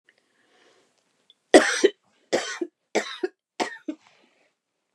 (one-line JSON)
{"three_cough_length": "4.9 s", "three_cough_amplitude": 29204, "three_cough_signal_mean_std_ratio": 0.25, "survey_phase": "beta (2021-08-13 to 2022-03-07)", "age": "65+", "gender": "Female", "wearing_mask": "No", "symptom_cough_any": true, "smoker_status": "Ex-smoker", "respiratory_condition_asthma": false, "respiratory_condition_other": true, "recruitment_source": "REACT", "submission_delay": "2 days", "covid_test_result": "Negative", "covid_test_method": "RT-qPCR", "influenza_a_test_result": "Negative", "influenza_b_test_result": "Negative"}